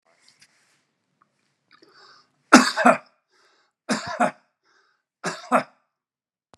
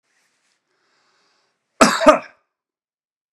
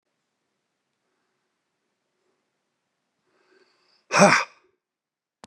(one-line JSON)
{"three_cough_length": "6.6 s", "three_cough_amplitude": 32768, "three_cough_signal_mean_std_ratio": 0.24, "cough_length": "3.3 s", "cough_amplitude": 32768, "cough_signal_mean_std_ratio": 0.23, "exhalation_length": "5.5 s", "exhalation_amplitude": 29656, "exhalation_signal_mean_std_ratio": 0.18, "survey_phase": "beta (2021-08-13 to 2022-03-07)", "age": "65+", "gender": "Male", "wearing_mask": "No", "symptom_none": true, "smoker_status": "Never smoked", "respiratory_condition_asthma": false, "respiratory_condition_other": false, "recruitment_source": "REACT", "submission_delay": "3 days", "covid_test_result": "Negative", "covid_test_method": "RT-qPCR"}